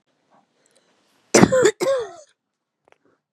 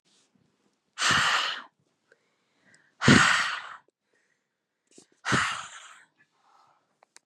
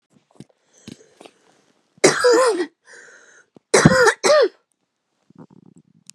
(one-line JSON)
{"cough_length": "3.3 s", "cough_amplitude": 32768, "cough_signal_mean_std_ratio": 0.32, "exhalation_length": "7.3 s", "exhalation_amplitude": 20505, "exhalation_signal_mean_std_ratio": 0.34, "three_cough_length": "6.1 s", "three_cough_amplitude": 32768, "three_cough_signal_mean_std_ratio": 0.37, "survey_phase": "beta (2021-08-13 to 2022-03-07)", "age": "18-44", "gender": "Female", "wearing_mask": "No", "symptom_cough_any": true, "symptom_runny_or_blocked_nose": true, "symptom_shortness_of_breath": true, "symptom_sore_throat": true, "symptom_fatigue": true, "symptom_fever_high_temperature": true, "symptom_headache": true, "smoker_status": "Never smoked", "respiratory_condition_asthma": false, "respiratory_condition_other": false, "recruitment_source": "Test and Trace", "submission_delay": "2 days", "covid_test_result": "Positive", "covid_test_method": "LFT"}